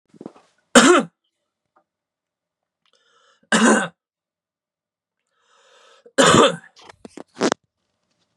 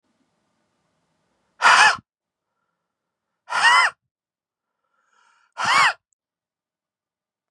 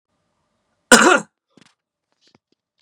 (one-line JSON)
{"three_cough_length": "8.4 s", "three_cough_amplitude": 32768, "three_cough_signal_mean_std_ratio": 0.28, "exhalation_length": "7.5 s", "exhalation_amplitude": 29748, "exhalation_signal_mean_std_ratio": 0.29, "cough_length": "2.8 s", "cough_amplitude": 32768, "cough_signal_mean_std_ratio": 0.24, "survey_phase": "beta (2021-08-13 to 2022-03-07)", "age": "18-44", "gender": "Male", "wearing_mask": "No", "symptom_cough_any": true, "symptom_runny_or_blocked_nose": true, "symptom_headache": true, "smoker_status": "Never smoked", "respiratory_condition_asthma": false, "respiratory_condition_other": false, "recruitment_source": "Test and Trace", "submission_delay": "1 day", "covid_test_result": "Positive", "covid_test_method": "LFT"}